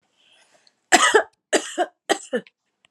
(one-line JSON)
{"cough_length": "2.9 s", "cough_amplitude": 32768, "cough_signal_mean_std_ratio": 0.35, "survey_phase": "alpha (2021-03-01 to 2021-08-12)", "age": "45-64", "gender": "Female", "wearing_mask": "No", "symptom_none": true, "symptom_onset": "9 days", "smoker_status": "Ex-smoker", "respiratory_condition_asthma": true, "respiratory_condition_other": false, "recruitment_source": "REACT", "submission_delay": "2 days", "covid_test_result": "Negative", "covid_test_method": "RT-qPCR"}